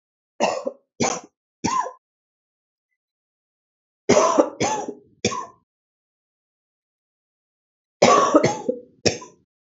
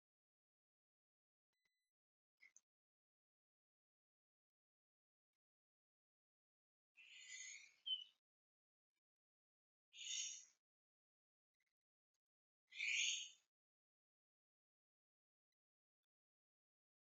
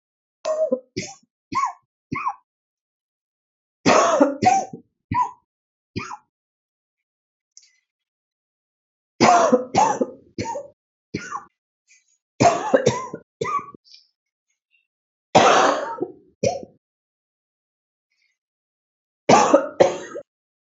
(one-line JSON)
{"three_cough_length": "9.6 s", "three_cough_amplitude": 29235, "three_cough_signal_mean_std_ratio": 0.35, "exhalation_length": "17.2 s", "exhalation_amplitude": 1010, "exhalation_signal_mean_std_ratio": 0.21, "cough_length": "20.7 s", "cough_amplitude": 28178, "cough_signal_mean_std_ratio": 0.36, "survey_phase": "beta (2021-08-13 to 2022-03-07)", "age": "45-64", "gender": "Female", "wearing_mask": "No", "symptom_cough_any": true, "symptom_new_continuous_cough": true, "symptom_runny_or_blocked_nose": true, "symptom_sore_throat": true, "symptom_abdominal_pain": true, "symptom_fatigue": true, "symptom_fever_high_temperature": true, "symptom_headache": true, "symptom_change_to_sense_of_smell_or_taste": true, "symptom_other": true, "symptom_onset": "2 days", "smoker_status": "Current smoker (11 or more cigarettes per day)", "respiratory_condition_asthma": false, "respiratory_condition_other": false, "recruitment_source": "Test and Trace", "submission_delay": "1 day", "covid_test_result": "Positive", "covid_test_method": "RT-qPCR", "covid_ct_value": 16.9, "covid_ct_gene": "ORF1ab gene"}